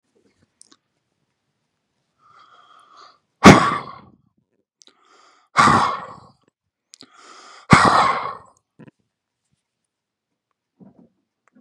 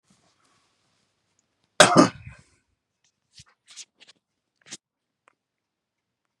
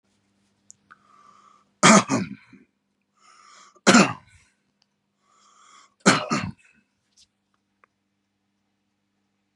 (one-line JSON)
{"exhalation_length": "11.6 s", "exhalation_amplitude": 32768, "exhalation_signal_mean_std_ratio": 0.24, "cough_length": "6.4 s", "cough_amplitude": 32767, "cough_signal_mean_std_ratio": 0.16, "three_cough_length": "9.6 s", "three_cough_amplitude": 32107, "three_cough_signal_mean_std_ratio": 0.23, "survey_phase": "beta (2021-08-13 to 2022-03-07)", "age": "45-64", "gender": "Male", "wearing_mask": "No", "symptom_none": true, "smoker_status": "Never smoked", "respiratory_condition_asthma": false, "respiratory_condition_other": false, "recruitment_source": "REACT", "submission_delay": "2 days", "covid_test_result": "Negative", "covid_test_method": "RT-qPCR", "influenza_a_test_result": "Negative", "influenza_b_test_result": "Negative"}